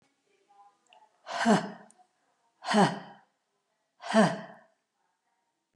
{"exhalation_length": "5.8 s", "exhalation_amplitude": 12465, "exhalation_signal_mean_std_ratio": 0.31, "survey_phase": "beta (2021-08-13 to 2022-03-07)", "age": "45-64", "gender": "Female", "wearing_mask": "No", "symptom_none": true, "smoker_status": "Never smoked", "respiratory_condition_asthma": false, "respiratory_condition_other": false, "recruitment_source": "REACT", "submission_delay": "1 day", "covid_test_result": "Negative", "covid_test_method": "RT-qPCR", "influenza_a_test_result": "Negative", "influenza_b_test_result": "Negative"}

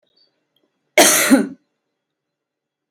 {"cough_length": "2.9 s", "cough_amplitude": 32768, "cough_signal_mean_std_ratio": 0.32, "survey_phase": "beta (2021-08-13 to 2022-03-07)", "age": "18-44", "gender": "Female", "wearing_mask": "No", "symptom_shortness_of_breath": true, "symptom_fatigue": true, "symptom_onset": "12 days", "smoker_status": "Ex-smoker", "respiratory_condition_asthma": false, "respiratory_condition_other": false, "recruitment_source": "REACT", "submission_delay": "4 days", "covid_test_result": "Negative", "covid_test_method": "RT-qPCR", "influenza_a_test_result": "Negative", "influenza_b_test_result": "Negative"}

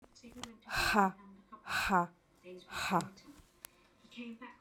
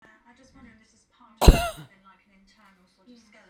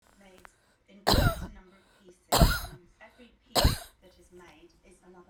{"exhalation_length": "4.6 s", "exhalation_amplitude": 6555, "exhalation_signal_mean_std_ratio": 0.45, "cough_length": "3.5 s", "cough_amplitude": 32768, "cough_signal_mean_std_ratio": 0.17, "three_cough_length": "5.3 s", "three_cough_amplitude": 14680, "three_cough_signal_mean_std_ratio": 0.33, "survey_phase": "beta (2021-08-13 to 2022-03-07)", "age": "45-64", "gender": "Female", "wearing_mask": "No", "symptom_cough_any": true, "symptom_runny_or_blocked_nose": true, "symptom_sore_throat": true, "symptom_fatigue": true, "symptom_headache": true, "symptom_onset": "6 days", "smoker_status": "Never smoked", "respiratory_condition_asthma": false, "respiratory_condition_other": false, "recruitment_source": "REACT", "submission_delay": "5 days", "covid_test_result": "Positive", "covid_test_method": "RT-qPCR", "covid_ct_value": 18.0, "covid_ct_gene": "E gene"}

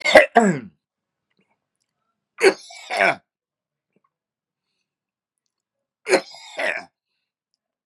{"three_cough_length": "7.9 s", "three_cough_amplitude": 32768, "three_cough_signal_mean_std_ratio": 0.26, "survey_phase": "beta (2021-08-13 to 2022-03-07)", "age": "45-64", "gender": "Male", "wearing_mask": "No", "symptom_none": true, "smoker_status": "Ex-smoker", "respiratory_condition_asthma": false, "respiratory_condition_other": false, "recruitment_source": "REACT", "submission_delay": "1 day", "covid_test_result": "Negative", "covid_test_method": "RT-qPCR", "influenza_a_test_result": "Negative", "influenza_b_test_result": "Negative"}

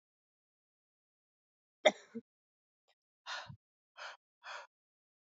{"exhalation_length": "5.3 s", "exhalation_amplitude": 9216, "exhalation_signal_mean_std_ratio": 0.15, "survey_phase": "beta (2021-08-13 to 2022-03-07)", "age": "18-44", "gender": "Female", "wearing_mask": "No", "symptom_cough_any": true, "symptom_new_continuous_cough": true, "symptom_runny_or_blocked_nose": true, "symptom_shortness_of_breath": true, "symptom_fatigue": true, "symptom_headache": true, "symptom_change_to_sense_of_smell_or_taste": true, "symptom_loss_of_taste": true, "symptom_onset": "3 days", "smoker_status": "Never smoked", "respiratory_condition_asthma": true, "respiratory_condition_other": false, "recruitment_source": "Test and Trace", "submission_delay": "2 days", "covid_test_result": "Positive", "covid_test_method": "ePCR"}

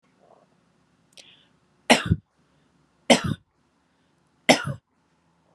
{"three_cough_length": "5.5 s", "three_cough_amplitude": 31043, "three_cough_signal_mean_std_ratio": 0.22, "survey_phase": "beta (2021-08-13 to 2022-03-07)", "age": "18-44", "gender": "Female", "wearing_mask": "No", "symptom_none": true, "smoker_status": "Never smoked", "respiratory_condition_asthma": false, "respiratory_condition_other": false, "recruitment_source": "REACT", "submission_delay": "5 days", "covid_test_result": "Negative", "covid_test_method": "RT-qPCR", "influenza_a_test_result": "Negative", "influenza_b_test_result": "Negative"}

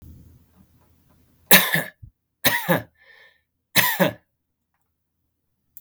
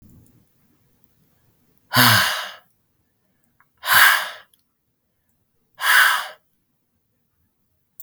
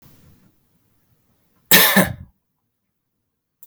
{"three_cough_length": "5.8 s", "three_cough_amplitude": 32768, "three_cough_signal_mean_std_ratio": 0.29, "exhalation_length": "8.0 s", "exhalation_amplitude": 32768, "exhalation_signal_mean_std_ratio": 0.32, "cough_length": "3.7 s", "cough_amplitude": 32768, "cough_signal_mean_std_ratio": 0.26, "survey_phase": "beta (2021-08-13 to 2022-03-07)", "age": "18-44", "gender": "Male", "wearing_mask": "No", "symptom_none": true, "smoker_status": "Never smoked", "respiratory_condition_asthma": false, "respiratory_condition_other": false, "recruitment_source": "REACT", "submission_delay": "1 day", "covid_test_result": "Negative", "covid_test_method": "RT-qPCR", "influenza_a_test_result": "Negative", "influenza_b_test_result": "Negative"}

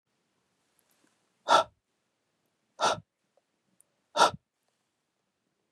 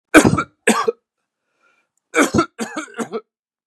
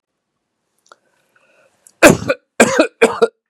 {"exhalation_length": "5.7 s", "exhalation_amplitude": 14131, "exhalation_signal_mean_std_ratio": 0.21, "three_cough_length": "3.7 s", "three_cough_amplitude": 32768, "three_cough_signal_mean_std_ratio": 0.37, "cough_length": "3.5 s", "cough_amplitude": 32768, "cough_signal_mean_std_ratio": 0.31, "survey_phase": "beta (2021-08-13 to 2022-03-07)", "age": "45-64", "gender": "Male", "wearing_mask": "No", "symptom_none": true, "smoker_status": "Never smoked", "respiratory_condition_asthma": false, "respiratory_condition_other": false, "recruitment_source": "REACT", "submission_delay": "12 days", "covid_test_result": "Negative", "covid_test_method": "RT-qPCR", "influenza_a_test_result": "Negative", "influenza_b_test_result": "Negative"}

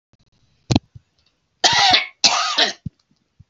{"cough_length": "3.5 s", "cough_amplitude": 32767, "cough_signal_mean_std_ratio": 0.41, "survey_phase": "beta (2021-08-13 to 2022-03-07)", "age": "65+", "gender": "Female", "wearing_mask": "No", "symptom_headache": true, "smoker_status": "Ex-smoker", "respiratory_condition_asthma": false, "respiratory_condition_other": false, "recruitment_source": "REACT", "submission_delay": "0 days", "covid_test_result": "Negative", "covid_test_method": "RT-qPCR"}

